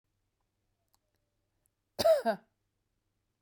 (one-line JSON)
{"cough_length": "3.4 s", "cough_amplitude": 5161, "cough_signal_mean_std_ratio": 0.24, "survey_phase": "beta (2021-08-13 to 2022-03-07)", "age": "65+", "gender": "Female", "wearing_mask": "No", "symptom_none": true, "smoker_status": "Never smoked", "respiratory_condition_asthma": false, "respiratory_condition_other": false, "recruitment_source": "REACT", "submission_delay": "4 days", "covid_test_result": "Negative", "covid_test_method": "RT-qPCR", "influenza_a_test_result": "Negative", "influenza_b_test_result": "Negative"}